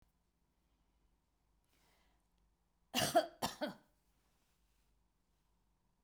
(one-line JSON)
{"cough_length": "6.0 s", "cough_amplitude": 3486, "cough_signal_mean_std_ratio": 0.22, "survey_phase": "beta (2021-08-13 to 2022-03-07)", "age": "65+", "gender": "Female", "wearing_mask": "No", "symptom_runny_or_blocked_nose": true, "smoker_status": "Never smoked", "respiratory_condition_asthma": false, "respiratory_condition_other": false, "recruitment_source": "REACT", "submission_delay": "1 day", "covid_test_result": "Negative", "covid_test_method": "RT-qPCR"}